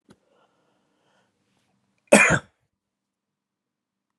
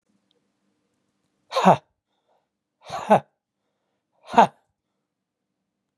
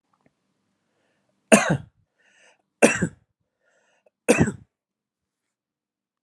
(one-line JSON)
{"cough_length": "4.2 s", "cough_amplitude": 32768, "cough_signal_mean_std_ratio": 0.19, "exhalation_length": "6.0 s", "exhalation_amplitude": 29259, "exhalation_signal_mean_std_ratio": 0.2, "three_cough_length": "6.2 s", "three_cough_amplitude": 32767, "three_cough_signal_mean_std_ratio": 0.23, "survey_phase": "alpha (2021-03-01 to 2021-08-12)", "age": "45-64", "gender": "Male", "wearing_mask": "No", "symptom_none": true, "smoker_status": "Never smoked", "respiratory_condition_asthma": true, "respiratory_condition_other": false, "recruitment_source": "REACT", "submission_delay": "4 days", "covid_test_result": "Negative", "covid_test_method": "RT-qPCR"}